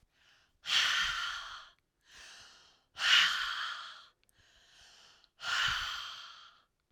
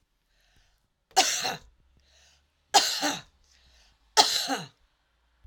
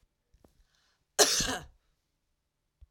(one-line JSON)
{"exhalation_length": "6.9 s", "exhalation_amplitude": 7803, "exhalation_signal_mean_std_ratio": 0.46, "three_cough_length": "5.5 s", "three_cough_amplitude": 24773, "three_cough_signal_mean_std_ratio": 0.33, "cough_length": "2.9 s", "cough_amplitude": 14524, "cough_signal_mean_std_ratio": 0.26, "survey_phase": "alpha (2021-03-01 to 2021-08-12)", "age": "45-64", "gender": "Female", "wearing_mask": "No", "symptom_headache": true, "smoker_status": "Never smoked", "respiratory_condition_asthma": false, "respiratory_condition_other": false, "recruitment_source": "REACT", "submission_delay": "1 day", "covid_test_result": "Negative", "covid_test_method": "RT-qPCR"}